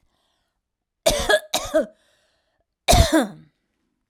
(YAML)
cough_length: 4.1 s
cough_amplitude: 28724
cough_signal_mean_std_ratio: 0.36
survey_phase: alpha (2021-03-01 to 2021-08-12)
age: 18-44
gender: Female
wearing_mask: 'No'
symptom_none: true
smoker_status: Ex-smoker
respiratory_condition_asthma: false
respiratory_condition_other: false
recruitment_source: REACT
submission_delay: 1 day
covid_test_result: Negative
covid_test_method: RT-qPCR